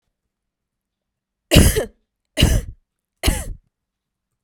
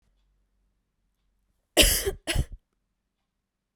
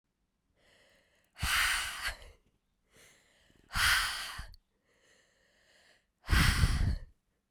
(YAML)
three_cough_length: 4.4 s
three_cough_amplitude: 32768
three_cough_signal_mean_std_ratio: 0.31
cough_length: 3.8 s
cough_amplitude: 23148
cough_signal_mean_std_ratio: 0.27
exhalation_length: 7.5 s
exhalation_amplitude: 6942
exhalation_signal_mean_std_ratio: 0.42
survey_phase: beta (2021-08-13 to 2022-03-07)
age: 18-44
gender: Female
wearing_mask: 'No'
symptom_runny_or_blocked_nose: true
symptom_fatigue: true
symptom_headache: true
symptom_onset: 3 days
smoker_status: Current smoker (11 or more cigarettes per day)
respiratory_condition_asthma: false
respiratory_condition_other: false
recruitment_source: Test and Trace
submission_delay: 2 days
covid_test_result: Positive
covid_test_method: RT-qPCR
covid_ct_value: 12.6
covid_ct_gene: S gene